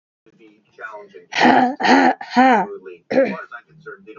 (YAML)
exhalation_length: 4.2 s
exhalation_amplitude: 31148
exhalation_signal_mean_std_ratio: 0.5
survey_phase: alpha (2021-03-01 to 2021-08-12)
age: 18-44
gender: Female
wearing_mask: 'No'
symptom_cough_any: true
symptom_new_continuous_cough: true
symptom_shortness_of_breath: true
symptom_abdominal_pain: true
symptom_diarrhoea: true
symptom_fatigue: true
symptom_fever_high_temperature: true
symptom_headache: true
smoker_status: Never smoked
respiratory_condition_asthma: false
respiratory_condition_other: false
recruitment_source: Test and Trace
submission_delay: 2 days
covid_test_result: Positive
covid_test_method: RT-qPCR